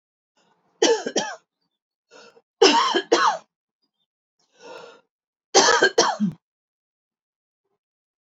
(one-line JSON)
{"three_cough_length": "8.3 s", "three_cough_amplitude": 29019, "three_cough_signal_mean_std_ratio": 0.35, "survey_phase": "beta (2021-08-13 to 2022-03-07)", "age": "45-64", "gender": "Female", "wearing_mask": "No", "symptom_cough_any": true, "symptom_runny_or_blocked_nose": true, "symptom_fatigue": true, "symptom_onset": "3 days", "smoker_status": "Never smoked", "respiratory_condition_asthma": false, "respiratory_condition_other": false, "recruitment_source": "Test and Trace", "submission_delay": "2 days", "covid_test_result": "Positive", "covid_test_method": "RT-qPCR", "covid_ct_value": 24.3, "covid_ct_gene": "ORF1ab gene"}